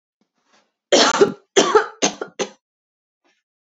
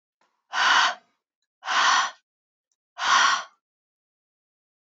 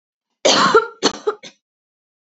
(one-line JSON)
{"three_cough_length": "3.8 s", "three_cough_amplitude": 31285, "three_cough_signal_mean_std_ratio": 0.35, "exhalation_length": "4.9 s", "exhalation_amplitude": 16805, "exhalation_signal_mean_std_ratio": 0.41, "cough_length": "2.2 s", "cough_amplitude": 29383, "cough_signal_mean_std_ratio": 0.41, "survey_phase": "beta (2021-08-13 to 2022-03-07)", "age": "18-44", "gender": "Female", "wearing_mask": "No", "symptom_runny_or_blocked_nose": true, "symptom_sore_throat": true, "smoker_status": "Never smoked", "respiratory_condition_asthma": false, "respiratory_condition_other": false, "recruitment_source": "Test and Trace", "submission_delay": "1 day", "covid_test_result": "Negative", "covid_test_method": "RT-qPCR"}